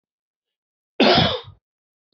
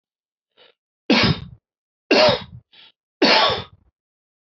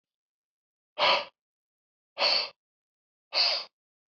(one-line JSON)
{"cough_length": "2.1 s", "cough_amplitude": 23354, "cough_signal_mean_std_ratio": 0.34, "three_cough_length": "4.4 s", "three_cough_amplitude": 23298, "three_cough_signal_mean_std_ratio": 0.39, "exhalation_length": "4.1 s", "exhalation_amplitude": 9423, "exhalation_signal_mean_std_ratio": 0.36, "survey_phase": "alpha (2021-03-01 to 2021-08-12)", "age": "45-64", "gender": "Male", "wearing_mask": "No", "symptom_cough_any": true, "symptom_fatigue": true, "symptom_headache": true, "symptom_onset": "4 days", "smoker_status": "Ex-smoker", "respiratory_condition_asthma": false, "respiratory_condition_other": false, "recruitment_source": "Test and Trace", "submission_delay": "1 day", "covid_test_result": "Positive", "covid_test_method": "RT-qPCR"}